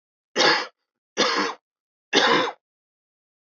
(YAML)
three_cough_length: 3.4 s
three_cough_amplitude: 19351
three_cough_signal_mean_std_ratio: 0.44
survey_phase: alpha (2021-03-01 to 2021-08-12)
age: 18-44
gender: Male
wearing_mask: 'No'
symptom_none: true
smoker_status: Never smoked
respiratory_condition_asthma: false
respiratory_condition_other: false
recruitment_source: REACT
submission_delay: 1 day
covid_test_result: Negative
covid_test_method: RT-qPCR